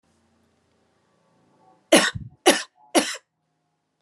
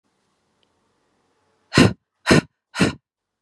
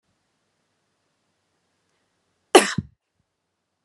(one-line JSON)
{"three_cough_length": "4.0 s", "three_cough_amplitude": 32247, "three_cough_signal_mean_std_ratio": 0.26, "exhalation_length": "3.4 s", "exhalation_amplitude": 30532, "exhalation_signal_mean_std_ratio": 0.27, "cough_length": "3.8 s", "cough_amplitude": 32586, "cough_signal_mean_std_ratio": 0.14, "survey_phase": "beta (2021-08-13 to 2022-03-07)", "age": "18-44", "gender": "Female", "wearing_mask": "No", "symptom_fatigue": true, "symptom_change_to_sense_of_smell_or_taste": true, "symptom_onset": "8 days", "smoker_status": "Ex-smoker", "respiratory_condition_asthma": false, "respiratory_condition_other": false, "recruitment_source": "Test and Trace", "submission_delay": "2 days", "covid_test_result": "Positive", "covid_test_method": "RT-qPCR", "covid_ct_value": 16.7, "covid_ct_gene": "ORF1ab gene", "covid_ct_mean": 17.0, "covid_viral_load": "2700000 copies/ml", "covid_viral_load_category": "High viral load (>1M copies/ml)"}